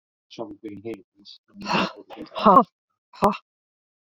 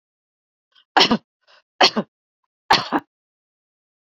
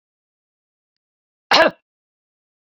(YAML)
exhalation_length: 4.2 s
exhalation_amplitude: 27503
exhalation_signal_mean_std_ratio: 0.31
three_cough_length: 4.0 s
three_cough_amplitude: 32767
three_cough_signal_mean_std_ratio: 0.27
cough_length: 2.7 s
cough_amplitude: 28442
cough_signal_mean_std_ratio: 0.2
survey_phase: beta (2021-08-13 to 2022-03-07)
age: 45-64
gender: Female
wearing_mask: 'No'
symptom_none: true
smoker_status: Never smoked
respiratory_condition_asthma: false
respiratory_condition_other: false
recruitment_source: REACT
submission_delay: 4 days
covid_test_result: Negative
covid_test_method: RT-qPCR